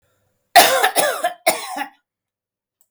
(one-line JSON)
{"three_cough_length": "2.9 s", "three_cough_amplitude": 32768, "three_cough_signal_mean_std_ratio": 0.4, "survey_phase": "beta (2021-08-13 to 2022-03-07)", "age": "45-64", "gender": "Female", "wearing_mask": "No", "symptom_none": true, "smoker_status": "Ex-smoker", "respiratory_condition_asthma": false, "respiratory_condition_other": false, "recruitment_source": "REACT", "submission_delay": "19 days", "covid_test_result": "Negative", "covid_test_method": "RT-qPCR", "influenza_a_test_result": "Negative", "influenza_b_test_result": "Negative"}